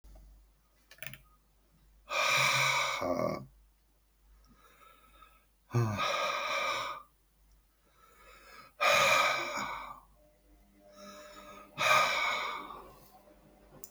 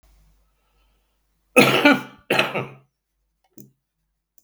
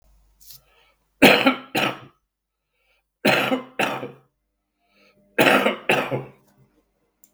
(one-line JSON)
{"exhalation_length": "13.9 s", "exhalation_amplitude": 7781, "exhalation_signal_mean_std_ratio": 0.49, "cough_length": "4.4 s", "cough_amplitude": 32768, "cough_signal_mean_std_ratio": 0.29, "three_cough_length": "7.3 s", "three_cough_amplitude": 32766, "three_cough_signal_mean_std_ratio": 0.36, "survey_phase": "beta (2021-08-13 to 2022-03-07)", "age": "65+", "gender": "Male", "wearing_mask": "No", "symptom_none": true, "smoker_status": "Current smoker (11 or more cigarettes per day)", "respiratory_condition_asthma": false, "respiratory_condition_other": false, "recruitment_source": "REACT", "submission_delay": "2 days", "covid_test_result": "Negative", "covid_test_method": "RT-qPCR"}